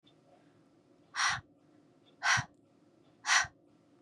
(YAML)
exhalation_length: 4.0 s
exhalation_amplitude: 6245
exhalation_signal_mean_std_ratio: 0.33
survey_phase: beta (2021-08-13 to 2022-03-07)
age: 18-44
gender: Female
wearing_mask: 'No'
symptom_none: true
smoker_status: Never smoked
respiratory_condition_asthma: false
respiratory_condition_other: false
recruitment_source: REACT
submission_delay: 1 day
covid_test_result: Negative
covid_test_method: RT-qPCR
influenza_a_test_result: Negative
influenza_b_test_result: Negative